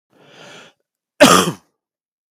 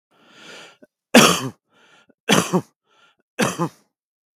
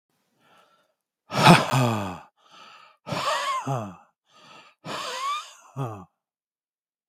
cough_length: 2.3 s
cough_amplitude: 32768
cough_signal_mean_std_ratio: 0.29
three_cough_length: 4.4 s
three_cough_amplitude: 32768
three_cough_signal_mean_std_ratio: 0.31
exhalation_length: 7.1 s
exhalation_amplitude: 32768
exhalation_signal_mean_std_ratio: 0.37
survey_phase: beta (2021-08-13 to 2022-03-07)
age: 45-64
gender: Male
wearing_mask: 'No'
symptom_none: true
smoker_status: Never smoked
respiratory_condition_asthma: false
respiratory_condition_other: false
recruitment_source: Test and Trace
submission_delay: 0 days
covid_test_result: Negative
covid_test_method: LFT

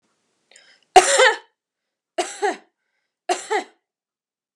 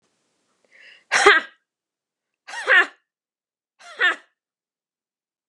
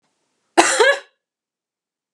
three_cough_length: 4.6 s
three_cough_amplitude: 32768
three_cough_signal_mean_std_ratio: 0.29
exhalation_length: 5.5 s
exhalation_amplitude: 32767
exhalation_signal_mean_std_ratio: 0.27
cough_length: 2.1 s
cough_amplitude: 32768
cough_signal_mean_std_ratio: 0.33
survey_phase: beta (2021-08-13 to 2022-03-07)
age: 45-64
gender: Female
wearing_mask: 'No'
symptom_none: true
smoker_status: Never smoked
respiratory_condition_asthma: false
respiratory_condition_other: false
recruitment_source: REACT
submission_delay: 2 days
covid_test_result: Negative
covid_test_method: RT-qPCR
influenza_a_test_result: Unknown/Void
influenza_b_test_result: Unknown/Void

